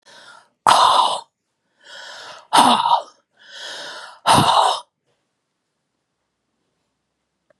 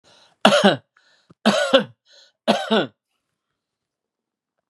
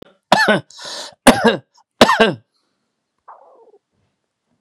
{"exhalation_length": "7.6 s", "exhalation_amplitude": 32768, "exhalation_signal_mean_std_ratio": 0.38, "three_cough_length": "4.7 s", "three_cough_amplitude": 32767, "three_cough_signal_mean_std_ratio": 0.34, "cough_length": "4.6 s", "cough_amplitude": 32768, "cough_signal_mean_std_ratio": 0.33, "survey_phase": "beta (2021-08-13 to 2022-03-07)", "age": "65+", "gender": "Male", "wearing_mask": "No", "symptom_cough_any": true, "smoker_status": "Never smoked", "respiratory_condition_asthma": false, "respiratory_condition_other": false, "recruitment_source": "REACT", "submission_delay": "3 days", "covid_test_result": "Negative", "covid_test_method": "RT-qPCR"}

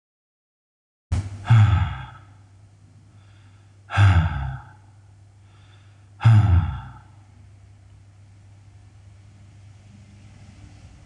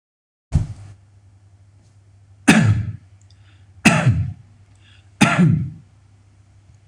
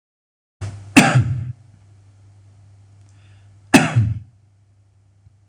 {"exhalation_length": "11.1 s", "exhalation_amplitude": 17600, "exhalation_signal_mean_std_ratio": 0.36, "three_cough_length": "6.9 s", "three_cough_amplitude": 26028, "three_cough_signal_mean_std_ratio": 0.39, "cough_length": "5.5 s", "cough_amplitude": 26028, "cough_signal_mean_std_ratio": 0.33, "survey_phase": "beta (2021-08-13 to 2022-03-07)", "age": "45-64", "gender": "Male", "wearing_mask": "No", "symptom_none": true, "smoker_status": "Ex-smoker", "respiratory_condition_asthma": false, "respiratory_condition_other": false, "recruitment_source": "REACT", "submission_delay": "0 days", "covid_test_result": "Negative", "covid_test_method": "RT-qPCR"}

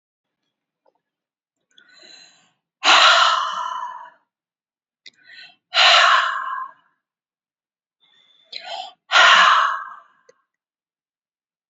{"exhalation_length": "11.7 s", "exhalation_amplitude": 32767, "exhalation_signal_mean_std_ratio": 0.36, "survey_phase": "beta (2021-08-13 to 2022-03-07)", "age": "65+", "gender": "Female", "wearing_mask": "No", "symptom_cough_any": true, "smoker_status": "Never smoked", "respiratory_condition_asthma": false, "respiratory_condition_other": false, "recruitment_source": "REACT", "submission_delay": "2 days", "covid_test_result": "Negative", "covid_test_method": "RT-qPCR", "influenza_a_test_result": "Negative", "influenza_b_test_result": "Negative"}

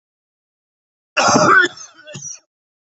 {"cough_length": "2.9 s", "cough_amplitude": 27320, "cough_signal_mean_std_ratio": 0.38, "survey_phase": "beta (2021-08-13 to 2022-03-07)", "age": "18-44", "gender": "Male", "wearing_mask": "No", "symptom_cough_any": true, "symptom_runny_or_blocked_nose": true, "symptom_sore_throat": true, "symptom_fatigue": true, "symptom_headache": true, "symptom_onset": "3 days", "smoker_status": "Never smoked", "respiratory_condition_asthma": false, "respiratory_condition_other": false, "recruitment_source": "Test and Trace", "submission_delay": "2 days", "covid_test_result": "Positive", "covid_test_method": "RT-qPCR", "covid_ct_value": 22.9, "covid_ct_gene": "ORF1ab gene"}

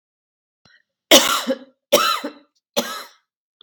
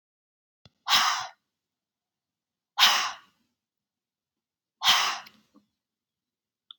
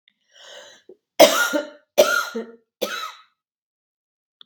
{"cough_length": "3.6 s", "cough_amplitude": 32768, "cough_signal_mean_std_ratio": 0.34, "exhalation_length": "6.8 s", "exhalation_amplitude": 20156, "exhalation_signal_mean_std_ratio": 0.29, "three_cough_length": "4.5 s", "three_cough_amplitude": 32768, "three_cough_signal_mean_std_ratio": 0.32, "survey_phase": "beta (2021-08-13 to 2022-03-07)", "age": "45-64", "gender": "Female", "wearing_mask": "No", "symptom_none": true, "symptom_onset": "2 days", "smoker_status": "Never smoked", "respiratory_condition_asthma": true, "respiratory_condition_other": false, "recruitment_source": "REACT", "submission_delay": "2 days", "covid_test_result": "Negative", "covid_test_method": "RT-qPCR", "influenza_a_test_result": "Negative", "influenza_b_test_result": "Negative"}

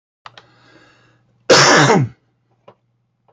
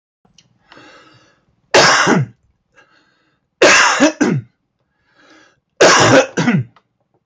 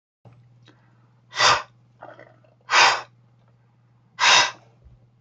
{"cough_length": "3.3 s", "cough_amplitude": 31754, "cough_signal_mean_std_ratio": 0.36, "three_cough_length": "7.3 s", "three_cough_amplitude": 31370, "three_cough_signal_mean_std_ratio": 0.45, "exhalation_length": "5.2 s", "exhalation_amplitude": 24959, "exhalation_signal_mean_std_ratio": 0.33, "survey_phase": "beta (2021-08-13 to 2022-03-07)", "age": "65+", "gender": "Male", "wearing_mask": "No", "symptom_none": true, "smoker_status": "Never smoked", "respiratory_condition_asthma": false, "respiratory_condition_other": false, "recruitment_source": "REACT", "submission_delay": "3 days", "covid_test_result": "Negative", "covid_test_method": "RT-qPCR", "influenza_a_test_result": "Negative", "influenza_b_test_result": "Negative"}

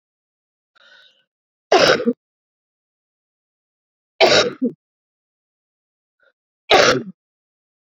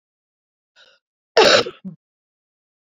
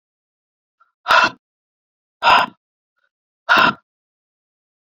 {"three_cough_length": "7.9 s", "three_cough_amplitude": 30989, "three_cough_signal_mean_std_ratio": 0.29, "cough_length": "2.9 s", "cough_amplitude": 28851, "cough_signal_mean_std_ratio": 0.26, "exhalation_length": "4.9 s", "exhalation_amplitude": 30544, "exhalation_signal_mean_std_ratio": 0.3, "survey_phase": "beta (2021-08-13 to 2022-03-07)", "age": "18-44", "gender": "Female", "wearing_mask": "No", "symptom_cough_any": true, "symptom_runny_or_blocked_nose": true, "symptom_fatigue": true, "symptom_change_to_sense_of_smell_or_taste": true, "symptom_onset": "4 days", "smoker_status": "Ex-smoker", "respiratory_condition_asthma": false, "respiratory_condition_other": false, "recruitment_source": "Test and Trace", "submission_delay": "2 days", "covid_test_result": "Positive", "covid_test_method": "RT-qPCR", "covid_ct_value": 29.9, "covid_ct_gene": "N gene", "covid_ct_mean": 30.0, "covid_viral_load": "140 copies/ml", "covid_viral_load_category": "Minimal viral load (< 10K copies/ml)"}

